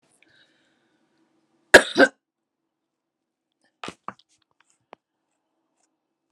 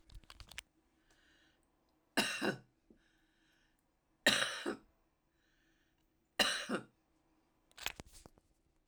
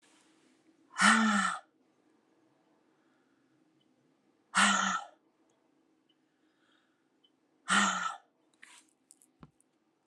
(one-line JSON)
{"cough_length": "6.3 s", "cough_amplitude": 32768, "cough_signal_mean_std_ratio": 0.13, "three_cough_length": "8.9 s", "three_cough_amplitude": 5329, "three_cough_signal_mean_std_ratio": 0.29, "exhalation_length": "10.1 s", "exhalation_amplitude": 10032, "exhalation_signal_mean_std_ratio": 0.31, "survey_phase": "alpha (2021-03-01 to 2021-08-12)", "age": "45-64", "gender": "Female", "wearing_mask": "No", "symptom_cough_any": true, "symptom_fatigue": true, "symptom_fever_high_temperature": true, "symptom_headache": true, "symptom_onset": "4 days", "smoker_status": "Never smoked", "respiratory_condition_asthma": false, "respiratory_condition_other": false, "recruitment_source": "Test and Trace", "submission_delay": "2 days", "covid_test_result": "Positive", "covid_test_method": "RT-qPCR", "covid_ct_value": 13.1, "covid_ct_gene": "ORF1ab gene"}